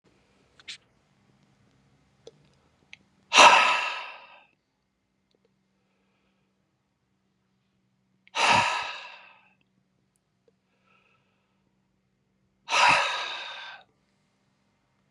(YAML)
exhalation_length: 15.1 s
exhalation_amplitude: 29295
exhalation_signal_mean_std_ratio: 0.25
survey_phase: beta (2021-08-13 to 2022-03-07)
age: 65+
gender: Male
wearing_mask: 'No'
symptom_runny_or_blocked_nose: true
smoker_status: Ex-smoker
respiratory_condition_asthma: false
respiratory_condition_other: false
recruitment_source: Test and Trace
submission_delay: 2 days
covid_test_result: Positive
covid_test_method: LFT